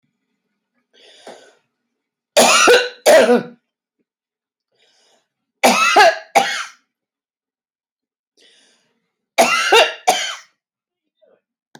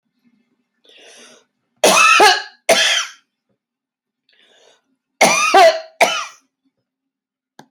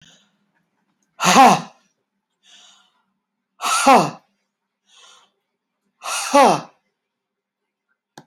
{"three_cough_length": "11.8 s", "three_cough_amplitude": 32340, "three_cough_signal_mean_std_ratio": 0.36, "cough_length": "7.7 s", "cough_amplitude": 32767, "cough_signal_mean_std_ratio": 0.38, "exhalation_length": "8.3 s", "exhalation_amplitude": 29633, "exhalation_signal_mean_std_ratio": 0.29, "survey_phase": "alpha (2021-03-01 to 2021-08-12)", "age": "65+", "gender": "Female", "wearing_mask": "No", "symptom_none": true, "smoker_status": "Ex-smoker", "respiratory_condition_asthma": false, "respiratory_condition_other": false, "recruitment_source": "REACT", "submission_delay": "2 days", "covid_test_result": "Negative", "covid_test_method": "RT-qPCR"}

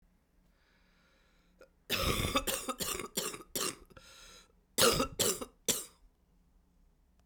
{"cough_length": "7.3 s", "cough_amplitude": 8776, "cough_signal_mean_std_ratio": 0.42, "survey_phase": "beta (2021-08-13 to 2022-03-07)", "age": "65+", "gender": "Female", "wearing_mask": "No", "symptom_cough_any": true, "symptom_new_continuous_cough": true, "symptom_runny_or_blocked_nose": true, "symptom_abdominal_pain": true, "symptom_fatigue": true, "symptom_fever_high_temperature": true, "symptom_headache": true, "symptom_change_to_sense_of_smell_or_taste": true, "symptom_loss_of_taste": true, "symptom_other": true, "smoker_status": "Never smoked", "respiratory_condition_asthma": false, "respiratory_condition_other": false, "recruitment_source": "Test and Trace", "submission_delay": "2 days", "covid_test_result": "Positive", "covid_test_method": "RT-qPCR", "covid_ct_value": 17.7, "covid_ct_gene": "ORF1ab gene", "covid_ct_mean": 18.1, "covid_viral_load": "1200000 copies/ml", "covid_viral_load_category": "High viral load (>1M copies/ml)"}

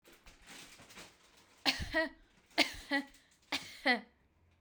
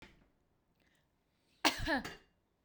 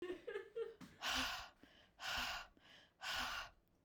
{"three_cough_length": "4.6 s", "three_cough_amplitude": 7537, "three_cough_signal_mean_std_ratio": 0.37, "cough_length": "2.6 s", "cough_amplitude": 7338, "cough_signal_mean_std_ratio": 0.29, "exhalation_length": "3.8 s", "exhalation_amplitude": 1251, "exhalation_signal_mean_std_ratio": 0.66, "survey_phase": "beta (2021-08-13 to 2022-03-07)", "age": "18-44", "gender": "Female", "wearing_mask": "No", "symptom_none": true, "smoker_status": "Never smoked", "respiratory_condition_asthma": false, "respiratory_condition_other": false, "recruitment_source": "REACT", "submission_delay": "2 days", "covid_test_result": "Negative", "covid_test_method": "RT-qPCR", "influenza_a_test_result": "Negative", "influenza_b_test_result": "Negative"}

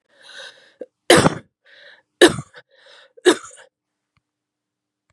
{"three_cough_length": "5.1 s", "three_cough_amplitude": 32768, "three_cough_signal_mean_std_ratio": 0.24, "survey_phase": "beta (2021-08-13 to 2022-03-07)", "age": "45-64", "gender": "Female", "wearing_mask": "No", "symptom_runny_or_blocked_nose": true, "symptom_fatigue": true, "symptom_fever_high_temperature": true, "symptom_onset": "3 days", "smoker_status": "Never smoked", "respiratory_condition_asthma": false, "respiratory_condition_other": false, "recruitment_source": "Test and Trace", "submission_delay": "2 days", "covid_test_result": "Positive", "covid_test_method": "RT-qPCR", "covid_ct_value": 16.8, "covid_ct_gene": "N gene", "covid_ct_mean": 17.8, "covid_viral_load": "1400000 copies/ml", "covid_viral_load_category": "High viral load (>1M copies/ml)"}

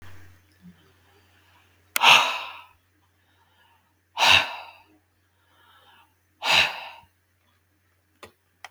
{"exhalation_length": "8.7 s", "exhalation_amplitude": 32766, "exhalation_signal_mean_std_ratio": 0.27, "survey_phase": "beta (2021-08-13 to 2022-03-07)", "age": "65+", "gender": "Male", "wearing_mask": "No", "symptom_none": true, "smoker_status": "Never smoked", "respiratory_condition_asthma": false, "respiratory_condition_other": true, "recruitment_source": "REACT", "submission_delay": "1 day", "covid_test_result": "Negative", "covid_test_method": "RT-qPCR", "influenza_a_test_result": "Negative", "influenza_b_test_result": "Negative"}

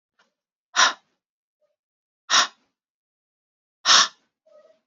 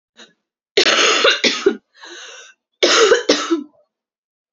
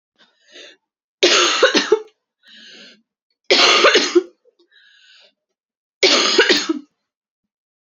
{"exhalation_length": "4.9 s", "exhalation_amplitude": 25382, "exhalation_signal_mean_std_ratio": 0.25, "cough_length": "4.5 s", "cough_amplitude": 31442, "cough_signal_mean_std_ratio": 0.49, "three_cough_length": "7.9 s", "three_cough_amplitude": 32767, "three_cough_signal_mean_std_ratio": 0.42, "survey_phase": "alpha (2021-03-01 to 2021-08-12)", "age": "18-44", "gender": "Female", "wearing_mask": "No", "symptom_cough_any": true, "symptom_fatigue": true, "symptom_fever_high_temperature": true, "smoker_status": "Never smoked", "respiratory_condition_asthma": true, "respiratory_condition_other": false, "recruitment_source": "Test and Trace", "submission_delay": "1 day", "covid_test_result": "Positive", "covid_test_method": "RT-qPCR"}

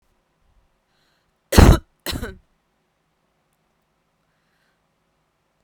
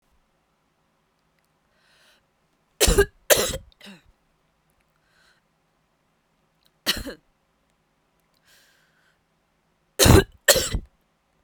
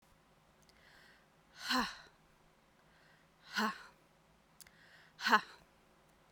{"cough_length": "5.6 s", "cough_amplitude": 32768, "cough_signal_mean_std_ratio": 0.17, "three_cough_length": "11.4 s", "three_cough_amplitude": 32767, "three_cough_signal_mean_std_ratio": 0.22, "exhalation_length": "6.3 s", "exhalation_amplitude": 6425, "exhalation_signal_mean_std_ratio": 0.28, "survey_phase": "beta (2021-08-13 to 2022-03-07)", "age": "18-44", "gender": "Female", "wearing_mask": "No", "symptom_cough_any": true, "symptom_runny_or_blocked_nose": true, "symptom_sore_throat": true, "symptom_headache": true, "symptom_onset": "5 days", "smoker_status": "Never smoked", "respiratory_condition_asthma": false, "respiratory_condition_other": false, "recruitment_source": "REACT", "submission_delay": "1 day", "covid_test_result": "Negative", "covid_test_method": "RT-qPCR"}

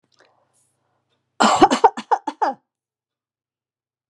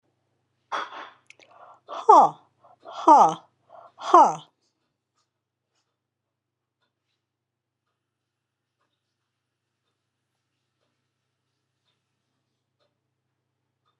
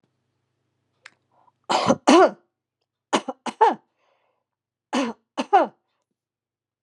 {"cough_length": "4.1 s", "cough_amplitude": 32768, "cough_signal_mean_std_ratio": 0.28, "exhalation_length": "14.0 s", "exhalation_amplitude": 27288, "exhalation_signal_mean_std_ratio": 0.19, "three_cough_length": "6.8 s", "three_cough_amplitude": 32013, "three_cough_signal_mean_std_ratio": 0.29, "survey_phase": "beta (2021-08-13 to 2022-03-07)", "age": "65+", "gender": "Female", "wearing_mask": "No", "symptom_none": true, "smoker_status": "Never smoked", "respiratory_condition_asthma": false, "respiratory_condition_other": false, "recruitment_source": "Test and Trace", "submission_delay": "1 day", "covid_test_result": "Positive", "covid_test_method": "RT-qPCR", "covid_ct_value": 29.9, "covid_ct_gene": "N gene"}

